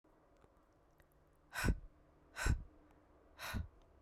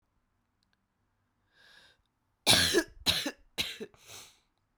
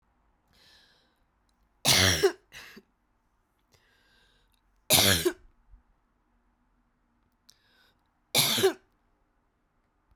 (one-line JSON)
{"exhalation_length": "4.0 s", "exhalation_amplitude": 2772, "exhalation_signal_mean_std_ratio": 0.35, "cough_length": "4.8 s", "cough_amplitude": 12323, "cough_signal_mean_std_ratio": 0.31, "three_cough_length": "10.2 s", "three_cough_amplitude": 18454, "three_cough_signal_mean_std_ratio": 0.28, "survey_phase": "beta (2021-08-13 to 2022-03-07)", "age": "45-64", "gender": "Female", "wearing_mask": "No", "symptom_cough_any": true, "symptom_runny_or_blocked_nose": true, "symptom_sore_throat": true, "symptom_fatigue": true, "smoker_status": "Never smoked", "respiratory_condition_asthma": false, "respiratory_condition_other": false, "recruitment_source": "Test and Trace", "submission_delay": "2 days", "covid_test_result": "Positive", "covid_test_method": "RT-qPCR", "covid_ct_value": 24.1, "covid_ct_gene": "ORF1ab gene"}